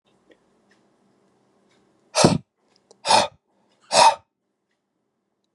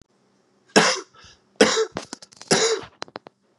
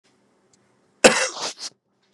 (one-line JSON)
{"exhalation_length": "5.5 s", "exhalation_amplitude": 32271, "exhalation_signal_mean_std_ratio": 0.26, "three_cough_length": "3.6 s", "three_cough_amplitude": 30008, "three_cough_signal_mean_std_ratio": 0.37, "cough_length": "2.1 s", "cough_amplitude": 32768, "cough_signal_mean_std_ratio": 0.26, "survey_phase": "beta (2021-08-13 to 2022-03-07)", "age": "18-44", "gender": "Male", "wearing_mask": "No", "symptom_runny_or_blocked_nose": true, "symptom_headache": true, "symptom_change_to_sense_of_smell_or_taste": true, "symptom_onset": "3 days", "smoker_status": "Never smoked", "respiratory_condition_asthma": false, "respiratory_condition_other": false, "recruitment_source": "Test and Trace", "submission_delay": "2 days", "covid_test_result": "Positive", "covid_test_method": "RT-qPCR"}